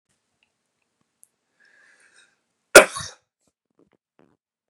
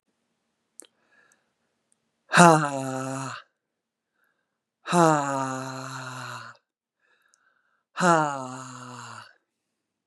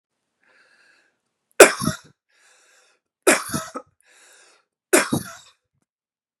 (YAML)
cough_length: 4.7 s
cough_amplitude: 32768
cough_signal_mean_std_ratio: 0.12
exhalation_length: 10.1 s
exhalation_amplitude: 32564
exhalation_signal_mean_std_ratio: 0.3
three_cough_length: 6.4 s
three_cough_amplitude: 32768
three_cough_signal_mean_std_ratio: 0.22
survey_phase: beta (2021-08-13 to 2022-03-07)
age: 45-64
gender: Female
wearing_mask: 'No'
symptom_none: true
smoker_status: Ex-smoker
respiratory_condition_asthma: false
respiratory_condition_other: false
recruitment_source: REACT
submission_delay: 3 days
covid_test_result: Negative
covid_test_method: RT-qPCR
influenza_a_test_result: Negative
influenza_b_test_result: Negative